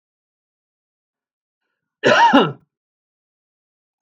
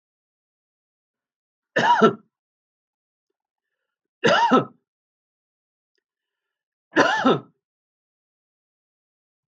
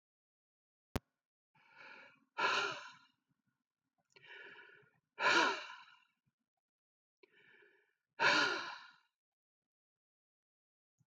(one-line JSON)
{"cough_length": "4.0 s", "cough_amplitude": 32766, "cough_signal_mean_std_ratio": 0.27, "three_cough_length": "9.5 s", "three_cough_amplitude": 25905, "three_cough_signal_mean_std_ratio": 0.28, "exhalation_length": "11.1 s", "exhalation_amplitude": 4191, "exhalation_signal_mean_std_ratio": 0.29, "survey_phase": "beta (2021-08-13 to 2022-03-07)", "age": "65+", "gender": "Male", "wearing_mask": "No", "symptom_none": true, "smoker_status": "Ex-smoker", "respiratory_condition_asthma": false, "respiratory_condition_other": false, "recruitment_source": "REACT", "submission_delay": "2 days", "covid_test_result": "Negative", "covid_test_method": "RT-qPCR", "influenza_a_test_result": "Negative", "influenza_b_test_result": "Negative"}